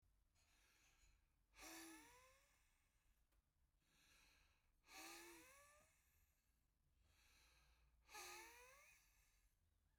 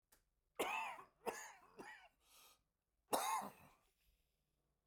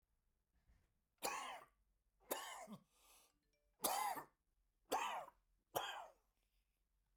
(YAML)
exhalation_length: 10.0 s
exhalation_amplitude: 148
exhalation_signal_mean_std_ratio: 0.57
cough_length: 4.9 s
cough_amplitude: 3149
cough_signal_mean_std_ratio: 0.38
three_cough_length: 7.2 s
three_cough_amplitude: 1996
three_cough_signal_mean_std_ratio: 0.39
survey_phase: beta (2021-08-13 to 2022-03-07)
age: 45-64
gender: Male
wearing_mask: 'No'
symptom_cough_any: true
smoker_status: Ex-smoker
respiratory_condition_asthma: false
respiratory_condition_other: false
recruitment_source: REACT
submission_delay: 1 day
covid_test_result: Negative
covid_test_method: RT-qPCR